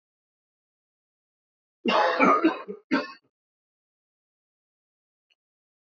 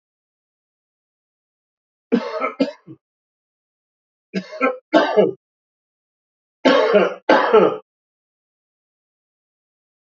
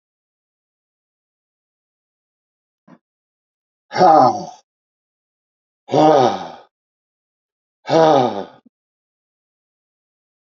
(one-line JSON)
{"cough_length": "5.9 s", "cough_amplitude": 18311, "cough_signal_mean_std_ratio": 0.3, "three_cough_length": "10.1 s", "three_cough_amplitude": 27979, "three_cough_signal_mean_std_ratio": 0.33, "exhalation_length": "10.4 s", "exhalation_amplitude": 31791, "exhalation_signal_mean_std_ratio": 0.28, "survey_phase": "alpha (2021-03-01 to 2021-08-12)", "age": "65+", "gender": "Male", "wearing_mask": "No", "symptom_cough_any": true, "smoker_status": "Ex-smoker", "respiratory_condition_asthma": false, "respiratory_condition_other": false, "recruitment_source": "REACT", "submission_delay": "1 day", "covid_test_result": "Negative", "covid_test_method": "RT-qPCR"}